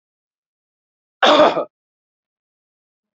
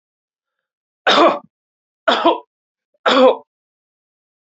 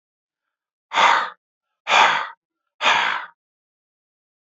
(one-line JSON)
{"cough_length": "3.2 s", "cough_amplitude": 29016, "cough_signal_mean_std_ratio": 0.27, "three_cough_length": "4.5 s", "three_cough_amplitude": 32767, "three_cough_signal_mean_std_ratio": 0.35, "exhalation_length": "4.5 s", "exhalation_amplitude": 27589, "exhalation_signal_mean_std_ratio": 0.39, "survey_phase": "beta (2021-08-13 to 2022-03-07)", "age": "45-64", "gender": "Male", "wearing_mask": "No", "symptom_headache": true, "smoker_status": "Ex-smoker", "respiratory_condition_asthma": false, "respiratory_condition_other": false, "recruitment_source": "REACT", "submission_delay": "1 day", "covid_test_result": "Negative", "covid_test_method": "RT-qPCR", "influenza_a_test_result": "Negative", "influenza_b_test_result": "Negative"}